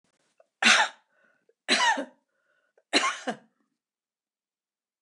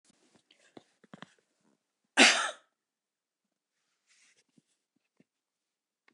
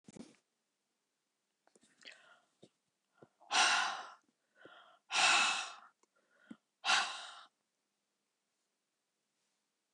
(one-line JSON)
{"three_cough_length": "5.0 s", "three_cough_amplitude": 18284, "three_cough_signal_mean_std_ratio": 0.32, "cough_length": "6.1 s", "cough_amplitude": 19260, "cough_signal_mean_std_ratio": 0.16, "exhalation_length": "9.9 s", "exhalation_amplitude": 4613, "exhalation_signal_mean_std_ratio": 0.31, "survey_phase": "beta (2021-08-13 to 2022-03-07)", "age": "65+", "gender": "Female", "wearing_mask": "No", "symptom_none": true, "smoker_status": "Never smoked", "respiratory_condition_asthma": true, "respiratory_condition_other": false, "recruitment_source": "REACT", "submission_delay": "1 day", "covid_test_result": "Negative", "covid_test_method": "RT-qPCR"}